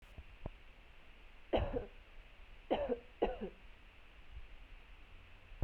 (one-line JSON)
{"three_cough_length": "5.6 s", "three_cough_amplitude": 3348, "three_cough_signal_mean_std_ratio": 0.5, "survey_phase": "beta (2021-08-13 to 2022-03-07)", "age": "18-44", "gender": "Female", "wearing_mask": "No", "symptom_fever_high_temperature": true, "symptom_headache": true, "symptom_change_to_sense_of_smell_or_taste": true, "symptom_loss_of_taste": true, "symptom_onset": "3 days", "smoker_status": "Ex-smoker", "respiratory_condition_asthma": false, "respiratory_condition_other": false, "recruitment_source": "Test and Trace", "submission_delay": "2 days", "covid_test_result": "Positive", "covid_test_method": "RT-qPCR", "covid_ct_value": 17.5, "covid_ct_gene": "ORF1ab gene", "covid_ct_mean": 17.9, "covid_viral_load": "1300000 copies/ml", "covid_viral_load_category": "High viral load (>1M copies/ml)"}